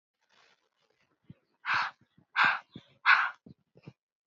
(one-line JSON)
{"exhalation_length": "4.3 s", "exhalation_amplitude": 12349, "exhalation_signal_mean_std_ratio": 0.31, "survey_phase": "beta (2021-08-13 to 2022-03-07)", "age": "18-44", "gender": "Female", "wearing_mask": "No", "symptom_none": true, "smoker_status": "Ex-smoker", "respiratory_condition_asthma": false, "respiratory_condition_other": false, "recruitment_source": "REACT", "submission_delay": "4 days", "covid_test_result": "Negative", "covid_test_method": "RT-qPCR", "influenza_a_test_result": "Negative", "influenza_b_test_result": "Negative"}